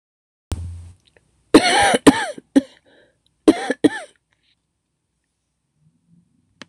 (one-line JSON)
{"cough_length": "6.7 s", "cough_amplitude": 26028, "cough_signal_mean_std_ratio": 0.28, "survey_phase": "beta (2021-08-13 to 2022-03-07)", "age": "45-64", "gender": "Female", "wearing_mask": "No", "symptom_cough_any": true, "symptom_runny_or_blocked_nose": true, "symptom_fatigue": true, "symptom_change_to_sense_of_smell_or_taste": true, "symptom_loss_of_taste": true, "symptom_onset": "3 days", "smoker_status": "Never smoked", "respiratory_condition_asthma": false, "respiratory_condition_other": false, "recruitment_source": "Test and Trace", "submission_delay": "2 days", "covid_test_result": "Positive", "covid_test_method": "RT-qPCR", "covid_ct_value": 16.8, "covid_ct_gene": "ORF1ab gene", "covid_ct_mean": 17.9, "covid_viral_load": "1300000 copies/ml", "covid_viral_load_category": "High viral load (>1M copies/ml)"}